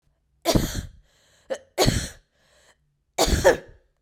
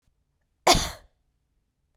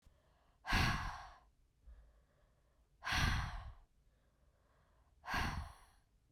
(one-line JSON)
{"three_cough_length": "4.0 s", "three_cough_amplitude": 25024, "three_cough_signal_mean_std_ratio": 0.38, "cough_length": "2.0 s", "cough_amplitude": 25659, "cough_signal_mean_std_ratio": 0.24, "exhalation_length": "6.3 s", "exhalation_amplitude": 2893, "exhalation_signal_mean_std_ratio": 0.42, "survey_phase": "beta (2021-08-13 to 2022-03-07)", "age": "18-44", "gender": "Female", "wearing_mask": "No", "symptom_runny_or_blocked_nose": true, "symptom_onset": "9 days", "smoker_status": "Never smoked", "respiratory_condition_asthma": false, "respiratory_condition_other": false, "recruitment_source": "REACT", "submission_delay": "1 day", "covid_test_result": "Negative", "covid_test_method": "RT-qPCR"}